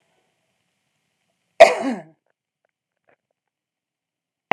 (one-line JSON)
{"cough_length": "4.5 s", "cough_amplitude": 32768, "cough_signal_mean_std_ratio": 0.16, "survey_phase": "beta (2021-08-13 to 2022-03-07)", "age": "65+", "gender": "Female", "wearing_mask": "No", "symptom_cough_any": true, "smoker_status": "Never smoked", "respiratory_condition_asthma": false, "respiratory_condition_other": false, "recruitment_source": "REACT", "submission_delay": "2 days", "covid_test_result": "Negative", "covid_test_method": "RT-qPCR"}